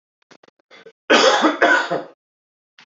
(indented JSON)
{
  "cough_length": "2.9 s",
  "cough_amplitude": 27632,
  "cough_signal_mean_std_ratio": 0.43,
  "survey_phase": "beta (2021-08-13 to 2022-03-07)",
  "age": "18-44",
  "gender": "Male",
  "wearing_mask": "No",
  "symptom_cough_any": true,
  "symptom_new_continuous_cough": true,
  "symptom_runny_or_blocked_nose": true,
  "symptom_sore_throat": true,
  "symptom_diarrhoea": true,
  "symptom_fatigue": true,
  "symptom_headache": true,
  "symptom_change_to_sense_of_smell_or_taste": true,
  "symptom_loss_of_taste": true,
  "symptom_onset": "2 days",
  "smoker_status": "Never smoked",
  "respiratory_condition_asthma": false,
  "respiratory_condition_other": false,
  "recruitment_source": "Test and Trace",
  "submission_delay": "1 day",
  "covid_test_result": "Positive",
  "covid_test_method": "RT-qPCR",
  "covid_ct_value": 20.8,
  "covid_ct_gene": "ORF1ab gene",
  "covid_ct_mean": 21.3,
  "covid_viral_load": "100000 copies/ml",
  "covid_viral_load_category": "Low viral load (10K-1M copies/ml)"
}